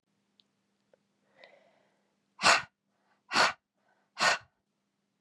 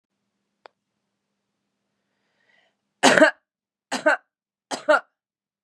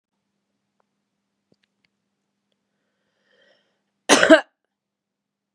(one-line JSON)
{"exhalation_length": "5.2 s", "exhalation_amplitude": 11568, "exhalation_signal_mean_std_ratio": 0.25, "three_cough_length": "5.6 s", "three_cough_amplitude": 32768, "three_cough_signal_mean_std_ratio": 0.24, "cough_length": "5.5 s", "cough_amplitude": 32768, "cough_signal_mean_std_ratio": 0.17, "survey_phase": "beta (2021-08-13 to 2022-03-07)", "age": "45-64", "gender": "Female", "wearing_mask": "No", "symptom_cough_any": true, "symptom_runny_or_blocked_nose": true, "symptom_sore_throat": true, "symptom_fatigue": true, "symptom_fever_high_temperature": true, "symptom_headache": true, "symptom_change_to_sense_of_smell_or_taste": true, "symptom_loss_of_taste": true, "symptom_onset": "3 days", "smoker_status": "Current smoker (1 to 10 cigarettes per day)", "respiratory_condition_asthma": false, "respiratory_condition_other": false, "recruitment_source": "Test and Trace", "submission_delay": "1 day", "covid_test_result": "Positive", "covid_test_method": "ePCR"}